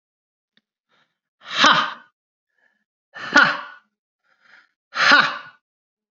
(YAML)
exhalation_length: 6.1 s
exhalation_amplitude: 32767
exhalation_signal_mean_std_ratio: 0.31
survey_phase: alpha (2021-03-01 to 2021-08-12)
age: 18-44
gender: Male
wearing_mask: 'No'
symptom_none: true
smoker_status: Never smoked
respiratory_condition_asthma: false
respiratory_condition_other: false
recruitment_source: REACT
submission_delay: 2 days
covid_test_result: Negative
covid_test_method: RT-qPCR